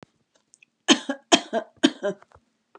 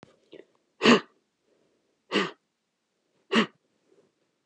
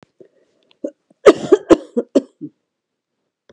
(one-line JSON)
{"three_cough_length": "2.8 s", "three_cough_amplitude": 28697, "three_cough_signal_mean_std_ratio": 0.28, "exhalation_length": "4.5 s", "exhalation_amplitude": 18791, "exhalation_signal_mean_std_ratio": 0.24, "cough_length": "3.5 s", "cough_amplitude": 32768, "cough_signal_mean_std_ratio": 0.24, "survey_phase": "beta (2021-08-13 to 2022-03-07)", "age": "65+", "gender": "Female", "wearing_mask": "No", "symptom_none": true, "smoker_status": "Never smoked", "respiratory_condition_asthma": false, "respiratory_condition_other": false, "recruitment_source": "REACT", "submission_delay": "2 days", "covid_test_result": "Negative", "covid_test_method": "RT-qPCR"}